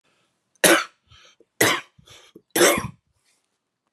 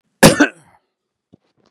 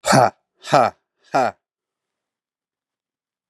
{"three_cough_length": "3.9 s", "three_cough_amplitude": 32357, "three_cough_signal_mean_std_ratio": 0.32, "cough_length": "1.7 s", "cough_amplitude": 32768, "cough_signal_mean_std_ratio": 0.27, "exhalation_length": "3.5 s", "exhalation_amplitude": 32761, "exhalation_signal_mean_std_ratio": 0.3, "survey_phase": "beta (2021-08-13 to 2022-03-07)", "age": "18-44", "gender": "Male", "wearing_mask": "No", "symptom_none": true, "smoker_status": "Ex-smoker", "respiratory_condition_asthma": false, "respiratory_condition_other": false, "recruitment_source": "Test and Trace", "submission_delay": "1 day", "covid_test_result": "Positive", "covid_test_method": "RT-qPCR", "covid_ct_value": 19.9, "covid_ct_gene": "ORF1ab gene", "covid_ct_mean": 20.6, "covid_viral_load": "170000 copies/ml", "covid_viral_load_category": "Low viral load (10K-1M copies/ml)"}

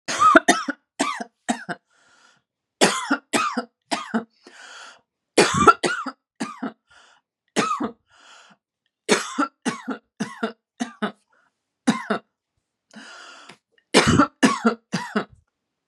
{"cough_length": "15.9 s", "cough_amplitude": 32768, "cough_signal_mean_std_ratio": 0.37, "survey_phase": "beta (2021-08-13 to 2022-03-07)", "age": "45-64", "gender": "Female", "wearing_mask": "No", "symptom_fatigue": true, "symptom_headache": true, "symptom_onset": "8 days", "smoker_status": "Ex-smoker", "respiratory_condition_asthma": false, "respiratory_condition_other": false, "recruitment_source": "REACT", "submission_delay": "0 days", "covid_test_result": "Negative", "covid_test_method": "RT-qPCR", "influenza_a_test_result": "Negative", "influenza_b_test_result": "Negative"}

